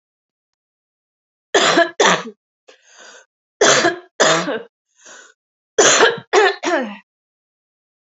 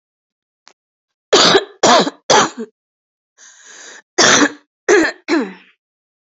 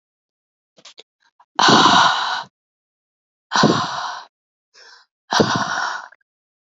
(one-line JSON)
{"three_cough_length": "8.1 s", "three_cough_amplitude": 32385, "three_cough_signal_mean_std_ratio": 0.41, "cough_length": "6.3 s", "cough_amplitude": 32767, "cough_signal_mean_std_ratio": 0.41, "exhalation_length": "6.7 s", "exhalation_amplitude": 29195, "exhalation_signal_mean_std_ratio": 0.41, "survey_phase": "beta (2021-08-13 to 2022-03-07)", "age": "18-44", "gender": "Female", "wearing_mask": "No", "symptom_cough_any": true, "symptom_new_continuous_cough": true, "symptom_runny_or_blocked_nose": true, "symptom_shortness_of_breath": true, "symptom_change_to_sense_of_smell_or_taste": true, "symptom_other": true, "symptom_onset": "6 days", "smoker_status": "Never smoked", "respiratory_condition_asthma": false, "respiratory_condition_other": false, "recruitment_source": "Test and Trace", "submission_delay": "1 day", "covid_test_result": "Positive", "covid_test_method": "RT-qPCR", "covid_ct_value": 31.8, "covid_ct_gene": "ORF1ab gene"}